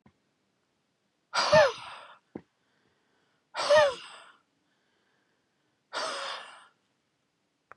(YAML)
exhalation_length: 7.8 s
exhalation_amplitude: 12749
exhalation_signal_mean_std_ratio: 0.28
survey_phase: beta (2021-08-13 to 2022-03-07)
age: 45-64
gender: Male
wearing_mask: 'No'
symptom_cough_any: true
symptom_runny_or_blocked_nose: true
symptom_fatigue: true
symptom_change_to_sense_of_smell_or_taste: true
symptom_loss_of_taste: true
symptom_onset: 7 days
smoker_status: Never smoked
respiratory_condition_asthma: false
respiratory_condition_other: false
recruitment_source: Test and Trace
submission_delay: 2 days
covid_test_result: Positive
covid_test_method: RT-qPCR
covid_ct_value: 14.8
covid_ct_gene: N gene
covid_ct_mean: 15.0
covid_viral_load: 12000000 copies/ml
covid_viral_load_category: High viral load (>1M copies/ml)